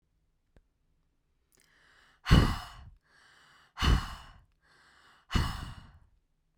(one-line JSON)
{"exhalation_length": "6.6 s", "exhalation_amplitude": 12937, "exhalation_signal_mean_std_ratio": 0.27, "survey_phase": "beta (2021-08-13 to 2022-03-07)", "age": "18-44", "gender": "Female", "wearing_mask": "No", "symptom_none": true, "smoker_status": "Never smoked", "respiratory_condition_asthma": false, "respiratory_condition_other": false, "recruitment_source": "REACT", "submission_delay": "2 days", "covid_test_result": "Negative", "covid_test_method": "RT-qPCR"}